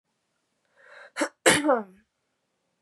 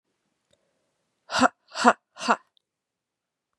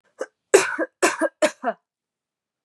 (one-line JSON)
{"cough_length": "2.8 s", "cough_amplitude": 21014, "cough_signal_mean_std_ratio": 0.3, "exhalation_length": "3.6 s", "exhalation_amplitude": 30700, "exhalation_signal_mean_std_ratio": 0.23, "three_cough_length": "2.6 s", "three_cough_amplitude": 30494, "three_cough_signal_mean_std_ratio": 0.35, "survey_phase": "beta (2021-08-13 to 2022-03-07)", "age": "18-44", "gender": "Female", "wearing_mask": "No", "symptom_cough_any": true, "symptom_runny_or_blocked_nose": true, "symptom_fatigue": true, "symptom_onset": "3 days", "smoker_status": "Never smoked", "respiratory_condition_asthma": false, "respiratory_condition_other": false, "recruitment_source": "Test and Trace", "submission_delay": "2 days", "covid_test_result": "Positive", "covid_test_method": "LAMP"}